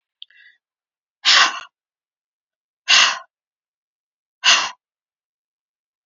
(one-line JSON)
{"exhalation_length": "6.1 s", "exhalation_amplitude": 32396, "exhalation_signal_mean_std_ratio": 0.28, "survey_phase": "beta (2021-08-13 to 2022-03-07)", "age": "65+", "gender": "Female", "wearing_mask": "No", "symptom_none": true, "smoker_status": "Ex-smoker", "respiratory_condition_asthma": true, "respiratory_condition_other": false, "recruitment_source": "REACT", "submission_delay": "2 days", "covid_test_result": "Negative", "covid_test_method": "RT-qPCR", "influenza_a_test_result": "Negative", "influenza_b_test_result": "Negative"}